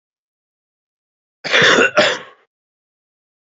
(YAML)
cough_length: 3.5 s
cough_amplitude: 32767
cough_signal_mean_std_ratio: 0.34
survey_phase: beta (2021-08-13 to 2022-03-07)
age: 18-44
gender: Male
wearing_mask: 'No'
symptom_cough_any: true
symptom_runny_or_blocked_nose: true
symptom_diarrhoea: true
symptom_onset: 4 days
smoker_status: Current smoker (e-cigarettes or vapes only)
respiratory_condition_asthma: false
respiratory_condition_other: false
recruitment_source: Test and Trace
submission_delay: 2 days
covid_test_result: Positive
covid_test_method: RT-qPCR
covid_ct_value: 13.2
covid_ct_gene: ORF1ab gene
covid_ct_mean: 13.5
covid_viral_load: 38000000 copies/ml
covid_viral_load_category: High viral load (>1M copies/ml)